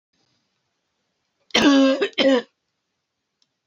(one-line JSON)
{"cough_length": "3.7 s", "cough_amplitude": 22437, "cough_signal_mean_std_ratio": 0.39, "survey_phase": "beta (2021-08-13 to 2022-03-07)", "age": "18-44", "gender": "Female", "wearing_mask": "No", "symptom_cough_any": true, "symptom_runny_or_blocked_nose": true, "symptom_shortness_of_breath": true, "symptom_fatigue": true, "symptom_headache": true, "smoker_status": "Never smoked", "respiratory_condition_asthma": false, "respiratory_condition_other": false, "recruitment_source": "Test and Trace", "submission_delay": "3 days", "covid_test_result": "Positive", "covid_test_method": "RT-qPCR", "covid_ct_value": 17.3, "covid_ct_gene": "N gene"}